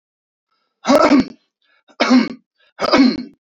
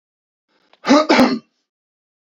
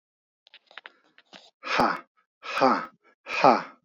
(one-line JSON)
{"three_cough_length": "3.4 s", "three_cough_amplitude": 30694, "three_cough_signal_mean_std_ratio": 0.46, "cough_length": "2.2 s", "cough_amplitude": 28754, "cough_signal_mean_std_ratio": 0.37, "exhalation_length": "3.8 s", "exhalation_amplitude": 21790, "exhalation_signal_mean_std_ratio": 0.36, "survey_phase": "beta (2021-08-13 to 2022-03-07)", "age": "18-44", "gender": "Male", "wearing_mask": "No", "symptom_headache": true, "smoker_status": "Ex-smoker", "respiratory_condition_asthma": false, "respiratory_condition_other": false, "recruitment_source": "REACT", "submission_delay": "3 days", "covid_test_result": "Negative", "covid_test_method": "RT-qPCR", "influenza_a_test_result": "Negative", "influenza_b_test_result": "Negative"}